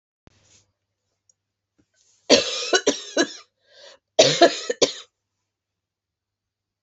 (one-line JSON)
{"cough_length": "6.8 s", "cough_amplitude": 28357, "cough_signal_mean_std_ratio": 0.29, "survey_phase": "beta (2021-08-13 to 2022-03-07)", "age": "45-64", "gender": "Female", "wearing_mask": "No", "symptom_cough_any": true, "symptom_runny_or_blocked_nose": true, "symptom_shortness_of_breath": true, "symptom_sore_throat": true, "symptom_fatigue": true, "symptom_headache": true, "smoker_status": "Never smoked", "respiratory_condition_asthma": false, "respiratory_condition_other": false, "recruitment_source": "Test and Trace", "submission_delay": "2 days", "covid_test_result": "Positive", "covid_test_method": "RT-qPCR", "covid_ct_value": 27.9, "covid_ct_gene": "ORF1ab gene"}